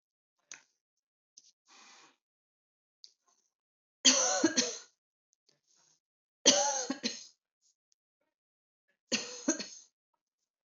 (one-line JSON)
{"three_cough_length": "10.8 s", "three_cough_amplitude": 13428, "three_cough_signal_mean_std_ratio": 0.27, "survey_phase": "beta (2021-08-13 to 2022-03-07)", "age": "45-64", "gender": "Female", "wearing_mask": "No", "symptom_none": true, "smoker_status": "Never smoked", "respiratory_condition_asthma": false, "respiratory_condition_other": false, "recruitment_source": "REACT", "submission_delay": "2 days", "covid_test_result": "Negative", "covid_test_method": "RT-qPCR", "influenza_a_test_result": "Negative", "influenza_b_test_result": "Negative"}